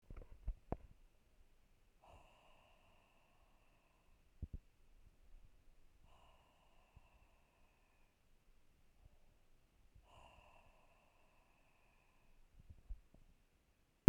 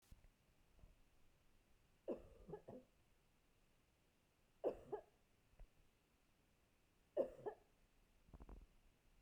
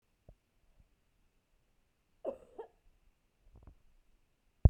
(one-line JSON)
{"exhalation_length": "14.1 s", "exhalation_amplitude": 9617, "exhalation_signal_mean_std_ratio": 0.17, "three_cough_length": "9.2 s", "three_cough_amplitude": 11783, "three_cough_signal_mean_std_ratio": 0.12, "cough_length": "4.7 s", "cough_amplitude": 11290, "cough_signal_mean_std_ratio": 0.1, "survey_phase": "beta (2021-08-13 to 2022-03-07)", "age": "45-64", "gender": "Female", "wearing_mask": "No", "symptom_headache": true, "symptom_onset": "3 days", "smoker_status": "Never smoked", "respiratory_condition_asthma": true, "respiratory_condition_other": false, "recruitment_source": "Test and Trace", "submission_delay": "1 day", "covid_test_result": "Positive", "covid_test_method": "RT-qPCR"}